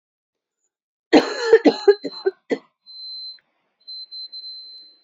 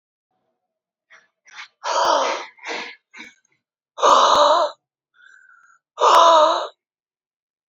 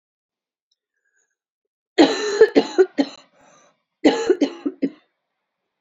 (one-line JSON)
{"cough_length": "5.0 s", "cough_amplitude": 29739, "cough_signal_mean_std_ratio": 0.31, "exhalation_length": "7.7 s", "exhalation_amplitude": 27091, "exhalation_signal_mean_std_ratio": 0.42, "three_cough_length": "5.8 s", "three_cough_amplitude": 27393, "three_cough_signal_mean_std_ratio": 0.33, "survey_phase": "beta (2021-08-13 to 2022-03-07)", "age": "18-44", "gender": "Female", "wearing_mask": "No", "symptom_cough_any": true, "symptom_shortness_of_breath": true, "symptom_sore_throat": true, "symptom_fatigue": true, "symptom_fever_high_temperature": true, "symptom_headache": true, "symptom_change_to_sense_of_smell_or_taste": true, "symptom_loss_of_taste": true, "symptom_onset": "9 days", "smoker_status": "Never smoked", "respiratory_condition_asthma": true, "respiratory_condition_other": true, "recruitment_source": "Test and Trace", "submission_delay": "1 day", "covid_test_result": "Positive", "covid_test_method": "RT-qPCR", "covid_ct_value": 16.3, "covid_ct_gene": "ORF1ab gene", "covid_ct_mean": 17.6, "covid_viral_load": "1700000 copies/ml", "covid_viral_load_category": "High viral load (>1M copies/ml)"}